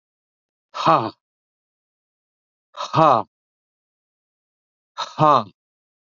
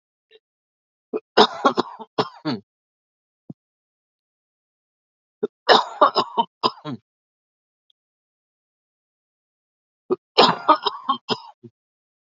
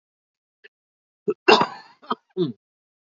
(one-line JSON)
{"exhalation_length": "6.1 s", "exhalation_amplitude": 31278, "exhalation_signal_mean_std_ratio": 0.27, "three_cough_length": "12.4 s", "three_cough_amplitude": 29297, "three_cough_signal_mean_std_ratio": 0.26, "cough_length": "3.1 s", "cough_amplitude": 28136, "cough_signal_mean_std_ratio": 0.26, "survey_phase": "alpha (2021-03-01 to 2021-08-12)", "age": "65+", "gender": "Male", "wearing_mask": "No", "symptom_cough_any": true, "smoker_status": "Ex-smoker", "respiratory_condition_asthma": false, "respiratory_condition_other": false, "recruitment_source": "Test and Trace", "submission_delay": "2 days", "covid_test_result": "Positive", "covid_test_method": "LFT"}